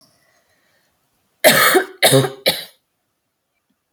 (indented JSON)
{
  "cough_length": "3.9 s",
  "cough_amplitude": 32767,
  "cough_signal_mean_std_ratio": 0.36,
  "survey_phase": "alpha (2021-03-01 to 2021-08-12)",
  "age": "18-44",
  "gender": "Female",
  "wearing_mask": "No",
  "symptom_cough_any": true,
  "smoker_status": "Never smoked",
  "respiratory_condition_asthma": false,
  "respiratory_condition_other": false,
  "recruitment_source": "REACT",
  "submission_delay": "4 days",
  "covid_test_result": "Negative",
  "covid_test_method": "RT-qPCR"
}